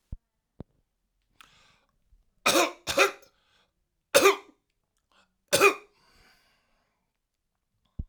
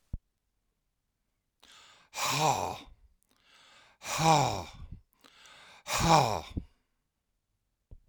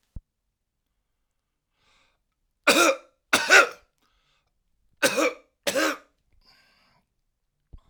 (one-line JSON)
{"three_cough_length": "8.1 s", "three_cough_amplitude": 21899, "three_cough_signal_mean_std_ratio": 0.25, "exhalation_length": "8.1 s", "exhalation_amplitude": 13738, "exhalation_signal_mean_std_ratio": 0.35, "cough_length": "7.9 s", "cough_amplitude": 26974, "cough_signal_mean_std_ratio": 0.28, "survey_phase": "alpha (2021-03-01 to 2021-08-12)", "age": "65+", "gender": "Male", "wearing_mask": "No", "symptom_none": true, "symptom_onset": "8 days", "smoker_status": "Ex-smoker", "respiratory_condition_asthma": true, "respiratory_condition_other": false, "recruitment_source": "REACT", "submission_delay": "2 days", "covid_test_result": "Negative", "covid_test_method": "RT-qPCR"}